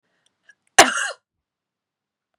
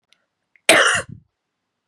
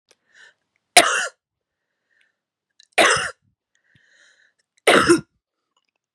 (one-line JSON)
{"exhalation_length": "2.4 s", "exhalation_amplitude": 32768, "exhalation_signal_mean_std_ratio": 0.2, "cough_length": "1.9 s", "cough_amplitude": 32767, "cough_signal_mean_std_ratio": 0.33, "three_cough_length": "6.1 s", "three_cough_amplitude": 32768, "three_cough_signal_mean_std_ratio": 0.28, "survey_phase": "beta (2021-08-13 to 2022-03-07)", "age": "45-64", "gender": "Female", "wearing_mask": "No", "symptom_runny_or_blocked_nose": true, "smoker_status": "Never smoked", "respiratory_condition_asthma": false, "respiratory_condition_other": false, "recruitment_source": "Test and Trace", "submission_delay": "2 days", "covid_test_result": "Positive", "covid_test_method": "RT-qPCR", "covid_ct_value": 18.3, "covid_ct_gene": "N gene", "covid_ct_mean": 18.4, "covid_viral_load": "930000 copies/ml", "covid_viral_load_category": "Low viral load (10K-1M copies/ml)"}